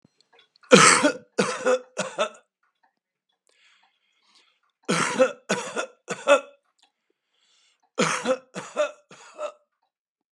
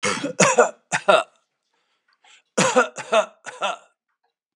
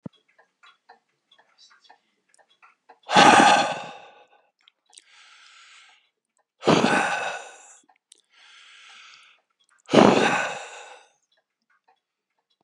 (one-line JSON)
{"three_cough_length": "10.3 s", "three_cough_amplitude": 32699, "three_cough_signal_mean_std_ratio": 0.34, "cough_length": "4.6 s", "cough_amplitude": 32584, "cough_signal_mean_std_ratio": 0.41, "exhalation_length": "12.6 s", "exhalation_amplitude": 32768, "exhalation_signal_mean_std_ratio": 0.3, "survey_phase": "beta (2021-08-13 to 2022-03-07)", "age": "65+", "gender": "Male", "wearing_mask": "No", "symptom_none": true, "smoker_status": "Ex-smoker", "respiratory_condition_asthma": false, "respiratory_condition_other": false, "recruitment_source": "REACT", "submission_delay": "5 days", "covid_test_result": "Negative", "covid_test_method": "RT-qPCR", "influenza_a_test_result": "Negative", "influenza_b_test_result": "Negative"}